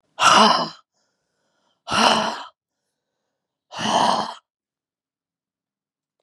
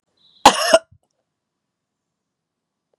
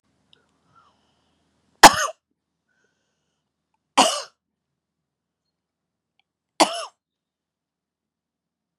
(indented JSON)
{
  "exhalation_length": "6.2 s",
  "exhalation_amplitude": 30898,
  "exhalation_signal_mean_std_ratio": 0.37,
  "cough_length": "3.0 s",
  "cough_amplitude": 32768,
  "cough_signal_mean_std_ratio": 0.21,
  "three_cough_length": "8.8 s",
  "three_cough_amplitude": 32768,
  "three_cough_signal_mean_std_ratio": 0.15,
  "survey_phase": "beta (2021-08-13 to 2022-03-07)",
  "age": "45-64",
  "gender": "Female",
  "wearing_mask": "No",
  "symptom_cough_any": true,
  "symptom_sore_throat": true,
  "symptom_fatigue": true,
  "symptom_onset": "4 days",
  "smoker_status": "Never smoked",
  "respiratory_condition_asthma": false,
  "respiratory_condition_other": false,
  "recruitment_source": "Test and Trace",
  "submission_delay": "1 day",
  "covid_test_result": "Positive",
  "covid_test_method": "RT-qPCR",
  "covid_ct_value": 15.9,
  "covid_ct_gene": "ORF1ab gene"
}